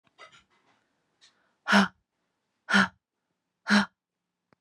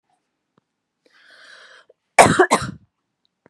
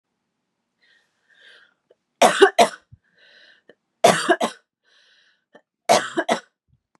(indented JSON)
{
  "exhalation_length": "4.6 s",
  "exhalation_amplitude": 15735,
  "exhalation_signal_mean_std_ratio": 0.27,
  "cough_length": "3.5 s",
  "cough_amplitude": 32768,
  "cough_signal_mean_std_ratio": 0.25,
  "three_cough_length": "7.0 s",
  "three_cough_amplitude": 32495,
  "three_cough_signal_mean_std_ratio": 0.28,
  "survey_phase": "beta (2021-08-13 to 2022-03-07)",
  "age": "18-44",
  "gender": "Female",
  "wearing_mask": "No",
  "symptom_none": true,
  "smoker_status": "Never smoked",
  "respiratory_condition_asthma": false,
  "respiratory_condition_other": false,
  "recruitment_source": "REACT",
  "submission_delay": "1 day",
  "covid_test_result": "Negative",
  "covid_test_method": "RT-qPCR"
}